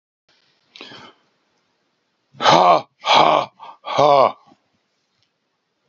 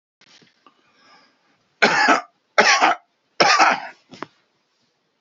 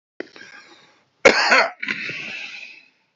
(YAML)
exhalation_length: 5.9 s
exhalation_amplitude: 32628
exhalation_signal_mean_std_ratio: 0.35
three_cough_length: 5.2 s
three_cough_amplitude: 30769
three_cough_signal_mean_std_ratio: 0.38
cough_length: 3.2 s
cough_amplitude: 29224
cough_signal_mean_std_ratio: 0.37
survey_phase: beta (2021-08-13 to 2022-03-07)
age: 65+
gender: Male
wearing_mask: 'No'
symptom_none: true
smoker_status: Ex-smoker
respiratory_condition_asthma: false
respiratory_condition_other: false
recruitment_source: REACT
submission_delay: 1 day
covid_test_result: Negative
covid_test_method: RT-qPCR
influenza_a_test_result: Negative
influenza_b_test_result: Negative